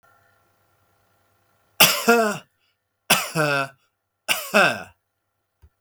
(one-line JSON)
{"three_cough_length": "5.8 s", "three_cough_amplitude": 32768, "three_cough_signal_mean_std_ratio": 0.36, "survey_phase": "beta (2021-08-13 to 2022-03-07)", "age": "45-64", "gender": "Male", "wearing_mask": "No", "symptom_none": true, "smoker_status": "Never smoked", "respiratory_condition_asthma": false, "respiratory_condition_other": false, "recruitment_source": "REACT", "submission_delay": "1 day", "covid_test_result": "Negative", "covid_test_method": "RT-qPCR", "influenza_a_test_result": "Negative", "influenza_b_test_result": "Negative"}